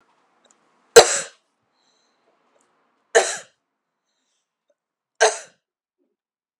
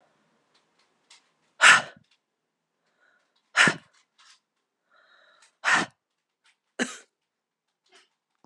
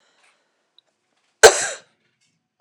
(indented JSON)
{
  "three_cough_length": "6.6 s",
  "three_cough_amplitude": 32768,
  "three_cough_signal_mean_std_ratio": 0.18,
  "exhalation_length": "8.5 s",
  "exhalation_amplitude": 29416,
  "exhalation_signal_mean_std_ratio": 0.2,
  "cough_length": "2.6 s",
  "cough_amplitude": 32768,
  "cough_signal_mean_std_ratio": 0.19,
  "survey_phase": "beta (2021-08-13 to 2022-03-07)",
  "age": "18-44",
  "gender": "Female",
  "wearing_mask": "No",
  "symptom_cough_any": true,
  "symptom_shortness_of_breath": true,
  "symptom_fatigue": true,
  "symptom_loss_of_taste": true,
  "smoker_status": "Never smoked",
  "respiratory_condition_asthma": false,
  "respiratory_condition_other": false,
  "recruitment_source": "Test and Trace",
  "submission_delay": "2 days",
  "covid_test_result": "Positive",
  "covid_test_method": "RT-qPCR",
  "covid_ct_value": 16.4,
  "covid_ct_gene": "ORF1ab gene",
  "covid_ct_mean": 17.5,
  "covid_viral_load": "1800000 copies/ml",
  "covid_viral_load_category": "High viral load (>1M copies/ml)"
}